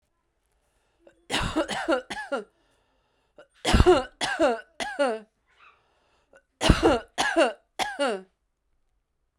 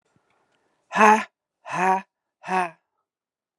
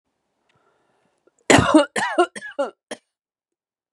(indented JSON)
{
  "three_cough_length": "9.4 s",
  "three_cough_amplitude": 28321,
  "three_cough_signal_mean_std_ratio": 0.4,
  "exhalation_length": "3.6 s",
  "exhalation_amplitude": 31153,
  "exhalation_signal_mean_std_ratio": 0.32,
  "cough_length": "3.9 s",
  "cough_amplitude": 32767,
  "cough_signal_mean_std_ratio": 0.31,
  "survey_phase": "beta (2021-08-13 to 2022-03-07)",
  "age": "45-64",
  "gender": "Female",
  "wearing_mask": "No",
  "symptom_cough_any": true,
  "symptom_runny_or_blocked_nose": true,
  "symptom_fatigue": true,
  "symptom_change_to_sense_of_smell_or_taste": true,
  "symptom_loss_of_taste": true,
  "symptom_onset": "4 days",
  "smoker_status": "Ex-smoker",
  "respiratory_condition_asthma": false,
  "respiratory_condition_other": false,
  "recruitment_source": "Test and Trace",
  "submission_delay": "2 days",
  "covid_test_result": "Positive",
  "covid_test_method": "RT-qPCR",
  "covid_ct_value": 16.5,
  "covid_ct_gene": "ORF1ab gene",
  "covid_ct_mean": 16.9,
  "covid_viral_load": "2800000 copies/ml",
  "covid_viral_load_category": "High viral load (>1M copies/ml)"
}